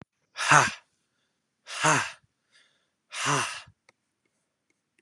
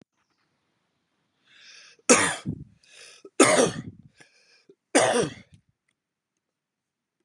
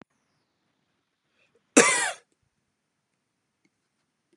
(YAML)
exhalation_length: 5.0 s
exhalation_amplitude: 23410
exhalation_signal_mean_std_ratio: 0.32
three_cough_length: 7.2 s
three_cough_amplitude: 23224
three_cough_signal_mean_std_ratio: 0.29
cough_length: 4.4 s
cough_amplitude: 27161
cough_signal_mean_std_ratio: 0.19
survey_phase: beta (2021-08-13 to 2022-03-07)
age: 18-44
gender: Male
wearing_mask: 'No'
symptom_cough_any: true
symptom_runny_or_blocked_nose: true
symptom_sore_throat: true
symptom_fatigue: true
symptom_headache: true
smoker_status: Never smoked
respiratory_condition_asthma: false
respiratory_condition_other: false
recruitment_source: Test and Trace
submission_delay: 1 day
covid_test_result: Positive
covid_test_method: RT-qPCR
covid_ct_value: 16.6
covid_ct_gene: N gene
covid_ct_mean: 16.8
covid_viral_load: 3200000 copies/ml
covid_viral_load_category: High viral load (>1M copies/ml)